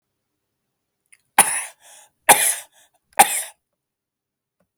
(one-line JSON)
{"three_cough_length": "4.8 s", "three_cough_amplitude": 32768, "three_cough_signal_mean_std_ratio": 0.25, "survey_phase": "alpha (2021-03-01 to 2021-08-12)", "age": "45-64", "gender": "Male", "wearing_mask": "No", "symptom_none": true, "smoker_status": "Never smoked", "respiratory_condition_asthma": true, "respiratory_condition_other": false, "recruitment_source": "REACT", "submission_delay": "2 days", "covid_test_method": "RT-qPCR"}